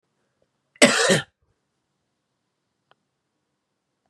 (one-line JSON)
{"cough_length": "4.1 s", "cough_amplitude": 29775, "cough_signal_mean_std_ratio": 0.23, "survey_phase": "beta (2021-08-13 to 2022-03-07)", "age": "45-64", "gender": "Male", "wearing_mask": "No", "symptom_cough_any": true, "symptom_runny_or_blocked_nose": true, "symptom_shortness_of_breath": true, "symptom_headache": true, "symptom_loss_of_taste": true, "smoker_status": "Never smoked", "respiratory_condition_asthma": false, "respiratory_condition_other": false, "recruitment_source": "Test and Trace", "submission_delay": "1 day", "covid_test_result": "Positive", "covid_test_method": "LFT"}